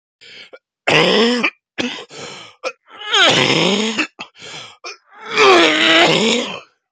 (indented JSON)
{
  "three_cough_length": "6.9 s",
  "three_cough_amplitude": 32768,
  "three_cough_signal_mean_std_ratio": 0.58,
  "survey_phase": "beta (2021-08-13 to 2022-03-07)",
  "age": "45-64",
  "gender": "Male",
  "wearing_mask": "No",
  "symptom_cough_any": true,
  "symptom_new_continuous_cough": true,
  "symptom_runny_or_blocked_nose": true,
  "symptom_shortness_of_breath": true,
  "symptom_sore_throat": true,
  "symptom_diarrhoea": true,
  "symptom_fever_high_temperature": true,
  "symptom_headache": true,
  "symptom_change_to_sense_of_smell_or_taste": true,
  "symptom_loss_of_taste": true,
  "symptom_onset": "8 days",
  "smoker_status": "Never smoked",
  "respiratory_condition_asthma": true,
  "respiratory_condition_other": false,
  "recruitment_source": "Test and Trace",
  "submission_delay": "1 day",
  "covid_test_result": "Negative",
  "covid_test_method": "RT-qPCR"
}